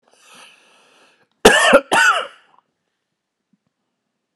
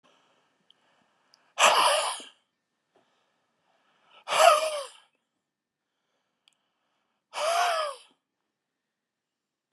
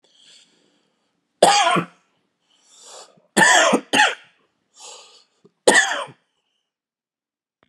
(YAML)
cough_length: 4.4 s
cough_amplitude: 32768
cough_signal_mean_std_ratio: 0.31
exhalation_length: 9.7 s
exhalation_amplitude: 18492
exhalation_signal_mean_std_ratio: 0.31
three_cough_length: 7.7 s
three_cough_amplitude: 32768
three_cough_signal_mean_std_ratio: 0.34
survey_phase: beta (2021-08-13 to 2022-03-07)
age: 45-64
gender: Male
wearing_mask: 'No'
symptom_cough_any: true
symptom_fatigue: true
symptom_fever_high_temperature: true
symptom_onset: 3 days
smoker_status: Never smoked
respiratory_condition_asthma: false
respiratory_condition_other: false
recruitment_source: Test and Trace
submission_delay: 2 days
covid_test_result: Positive
covid_test_method: RT-qPCR
covid_ct_value: 22.4
covid_ct_gene: ORF1ab gene
covid_ct_mean: 22.5
covid_viral_load: 41000 copies/ml
covid_viral_load_category: Low viral load (10K-1M copies/ml)